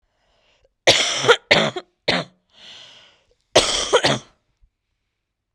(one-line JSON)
{"cough_length": "5.5 s", "cough_amplitude": 32768, "cough_signal_mean_std_ratio": 0.37, "survey_phase": "beta (2021-08-13 to 2022-03-07)", "age": "18-44", "gender": "Female", "wearing_mask": "No", "symptom_cough_any": true, "symptom_runny_or_blocked_nose": true, "symptom_shortness_of_breath": true, "symptom_sore_throat": true, "symptom_fatigue": true, "symptom_headache": true, "symptom_onset": "3 days", "smoker_status": "Current smoker (e-cigarettes or vapes only)", "respiratory_condition_asthma": true, "respiratory_condition_other": false, "recruitment_source": "Test and Trace", "submission_delay": "2 days", "covid_test_result": "Positive", "covid_test_method": "ePCR"}